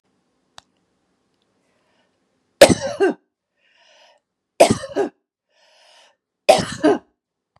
{"three_cough_length": "7.6 s", "three_cough_amplitude": 32768, "three_cough_signal_mean_std_ratio": 0.25, "survey_phase": "beta (2021-08-13 to 2022-03-07)", "age": "45-64", "gender": "Female", "wearing_mask": "No", "symptom_runny_or_blocked_nose": true, "symptom_fatigue": true, "symptom_change_to_sense_of_smell_or_taste": true, "smoker_status": "Never smoked", "respiratory_condition_asthma": false, "respiratory_condition_other": false, "recruitment_source": "Test and Trace", "submission_delay": "1 day", "covid_test_result": "Positive", "covid_test_method": "RT-qPCR", "covid_ct_value": 18.7, "covid_ct_gene": "ORF1ab gene"}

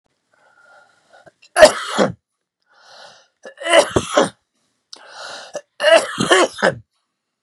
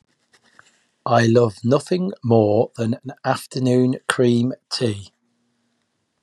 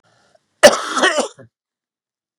{"three_cough_length": "7.4 s", "three_cough_amplitude": 32768, "three_cough_signal_mean_std_ratio": 0.35, "exhalation_length": "6.2 s", "exhalation_amplitude": 28249, "exhalation_signal_mean_std_ratio": 0.53, "cough_length": "2.4 s", "cough_amplitude": 32768, "cough_signal_mean_std_ratio": 0.31, "survey_phase": "beta (2021-08-13 to 2022-03-07)", "age": "45-64", "gender": "Male", "wearing_mask": "No", "symptom_cough_any": true, "symptom_new_continuous_cough": true, "symptom_runny_or_blocked_nose": true, "symptom_headache": true, "smoker_status": "Never smoked", "respiratory_condition_asthma": false, "respiratory_condition_other": false, "recruitment_source": "Test and Trace", "submission_delay": "2 days", "covid_test_result": "Positive", "covid_test_method": "RT-qPCR", "covid_ct_value": 20.4, "covid_ct_gene": "ORF1ab gene"}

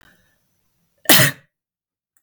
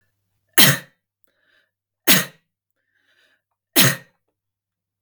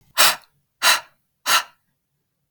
{"cough_length": "2.2 s", "cough_amplitude": 32768, "cough_signal_mean_std_ratio": 0.25, "three_cough_length": "5.0 s", "three_cough_amplitude": 32768, "three_cough_signal_mean_std_ratio": 0.25, "exhalation_length": "2.5 s", "exhalation_amplitude": 32768, "exhalation_signal_mean_std_ratio": 0.35, "survey_phase": "beta (2021-08-13 to 2022-03-07)", "age": "18-44", "gender": "Female", "wearing_mask": "No", "symptom_none": true, "smoker_status": "Never smoked", "respiratory_condition_asthma": false, "respiratory_condition_other": false, "recruitment_source": "REACT", "submission_delay": "0 days", "covid_test_result": "Negative", "covid_test_method": "RT-qPCR", "influenza_a_test_result": "Unknown/Void", "influenza_b_test_result": "Unknown/Void"}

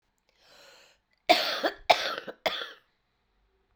{"cough_length": "3.8 s", "cough_amplitude": 21529, "cough_signal_mean_std_ratio": 0.32, "survey_phase": "alpha (2021-03-01 to 2021-08-12)", "age": "65+", "gender": "Female", "wearing_mask": "No", "symptom_cough_any": true, "symptom_shortness_of_breath": true, "symptom_diarrhoea": true, "symptom_fatigue": true, "symptom_fever_high_temperature": true, "symptom_headache": true, "smoker_status": "Never smoked", "respiratory_condition_asthma": false, "respiratory_condition_other": false, "recruitment_source": "Test and Trace", "submission_delay": "3 days", "covid_test_result": "Positive", "covid_test_method": "LFT"}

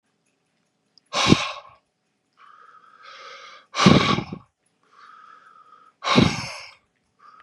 {"exhalation_length": "7.4 s", "exhalation_amplitude": 32768, "exhalation_signal_mean_std_ratio": 0.31, "survey_phase": "beta (2021-08-13 to 2022-03-07)", "age": "45-64", "gender": "Male", "wearing_mask": "No", "symptom_cough_any": true, "symptom_runny_or_blocked_nose": true, "symptom_sore_throat": true, "symptom_diarrhoea": true, "symptom_fatigue": true, "symptom_headache": true, "symptom_change_to_sense_of_smell_or_taste": true, "symptom_onset": "2 days", "smoker_status": "Ex-smoker", "respiratory_condition_asthma": false, "respiratory_condition_other": false, "recruitment_source": "Test and Trace", "submission_delay": "0 days", "covid_test_result": "Positive", "covid_test_method": "RT-qPCR", "covid_ct_value": 16.9, "covid_ct_gene": "N gene"}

